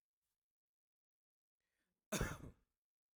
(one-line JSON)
{"cough_length": "3.2 s", "cough_amplitude": 1885, "cough_signal_mean_std_ratio": 0.23, "survey_phase": "alpha (2021-03-01 to 2021-08-12)", "age": "18-44", "gender": "Male", "wearing_mask": "No", "symptom_none": true, "smoker_status": "Never smoked", "respiratory_condition_asthma": false, "respiratory_condition_other": false, "recruitment_source": "REACT", "submission_delay": "1 day", "covid_test_result": "Negative", "covid_test_method": "RT-qPCR"}